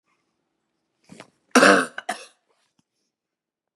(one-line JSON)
{"cough_length": "3.8 s", "cough_amplitude": 31012, "cough_signal_mean_std_ratio": 0.23, "survey_phase": "beta (2021-08-13 to 2022-03-07)", "age": "45-64", "gender": "Female", "wearing_mask": "No", "symptom_cough_any": true, "symptom_runny_or_blocked_nose": true, "symptom_sore_throat": true, "symptom_headache": true, "symptom_onset": "4 days", "smoker_status": "Never smoked", "respiratory_condition_asthma": false, "respiratory_condition_other": false, "recruitment_source": "Test and Trace", "submission_delay": "2 days", "covid_test_result": "Positive", "covid_test_method": "RT-qPCR", "covid_ct_value": 14.7, "covid_ct_gene": "ORF1ab gene"}